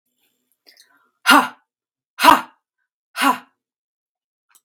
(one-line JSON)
{"exhalation_length": "4.6 s", "exhalation_amplitude": 32767, "exhalation_signal_mean_std_ratio": 0.25, "survey_phase": "beta (2021-08-13 to 2022-03-07)", "age": "45-64", "gender": "Female", "wearing_mask": "No", "symptom_cough_any": true, "symptom_runny_or_blocked_nose": true, "symptom_fatigue": true, "smoker_status": "Never smoked", "respiratory_condition_asthma": false, "respiratory_condition_other": false, "recruitment_source": "REACT", "submission_delay": "0 days", "covid_test_result": "Negative", "covid_test_method": "RT-qPCR"}